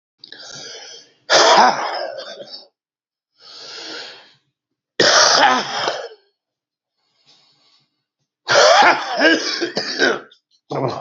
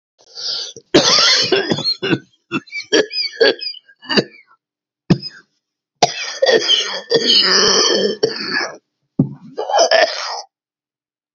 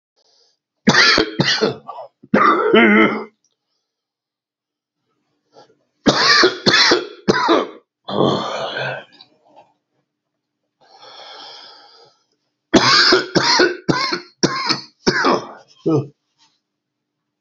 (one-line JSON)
{"exhalation_length": "11.0 s", "exhalation_amplitude": 32767, "exhalation_signal_mean_std_ratio": 0.46, "cough_length": "11.3 s", "cough_amplitude": 32768, "cough_signal_mean_std_ratio": 0.56, "three_cough_length": "17.4 s", "three_cough_amplitude": 32768, "three_cough_signal_mean_std_ratio": 0.47, "survey_phase": "alpha (2021-03-01 to 2021-08-12)", "age": "45-64", "gender": "Male", "wearing_mask": "No", "symptom_cough_any": true, "symptom_new_continuous_cough": true, "symptom_shortness_of_breath": true, "symptom_fatigue": true, "symptom_fever_high_temperature": true, "symptom_headache": true, "symptom_change_to_sense_of_smell_or_taste": true, "symptom_onset": "4 days", "smoker_status": "Never smoked", "respiratory_condition_asthma": false, "respiratory_condition_other": false, "recruitment_source": "Test and Trace", "submission_delay": "2 days", "covid_test_result": "Positive", "covid_test_method": "RT-qPCR", "covid_ct_value": 31.9, "covid_ct_gene": "ORF1ab gene", "covid_ct_mean": 33.2, "covid_viral_load": "13 copies/ml", "covid_viral_load_category": "Minimal viral load (< 10K copies/ml)"}